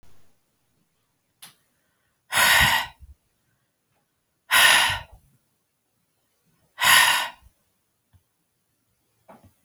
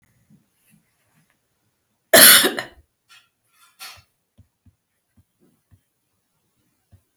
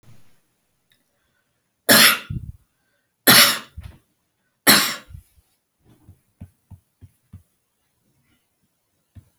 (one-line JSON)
{"exhalation_length": "9.6 s", "exhalation_amplitude": 24576, "exhalation_signal_mean_std_ratio": 0.32, "cough_length": "7.2 s", "cough_amplitude": 32768, "cough_signal_mean_std_ratio": 0.19, "three_cough_length": "9.4 s", "three_cough_amplitude": 32768, "three_cough_signal_mean_std_ratio": 0.25, "survey_phase": "beta (2021-08-13 to 2022-03-07)", "age": "65+", "gender": "Female", "wearing_mask": "No", "symptom_none": true, "smoker_status": "Never smoked", "respiratory_condition_asthma": false, "respiratory_condition_other": false, "recruitment_source": "REACT", "submission_delay": "2 days", "covid_test_result": "Negative", "covid_test_method": "RT-qPCR"}